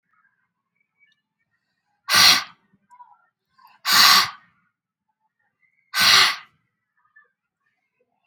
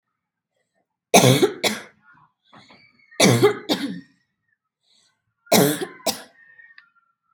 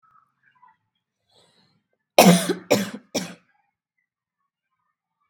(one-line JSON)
{"exhalation_length": "8.3 s", "exhalation_amplitude": 32163, "exhalation_signal_mean_std_ratio": 0.29, "three_cough_length": "7.3 s", "three_cough_amplitude": 32768, "three_cough_signal_mean_std_ratio": 0.34, "cough_length": "5.3 s", "cough_amplitude": 32767, "cough_signal_mean_std_ratio": 0.24, "survey_phase": "beta (2021-08-13 to 2022-03-07)", "age": "18-44", "gender": "Female", "wearing_mask": "No", "symptom_none": true, "smoker_status": "Ex-smoker", "respiratory_condition_asthma": false, "respiratory_condition_other": false, "recruitment_source": "REACT", "submission_delay": "1 day", "covid_test_result": "Negative", "covid_test_method": "RT-qPCR", "influenza_a_test_result": "Negative", "influenza_b_test_result": "Negative"}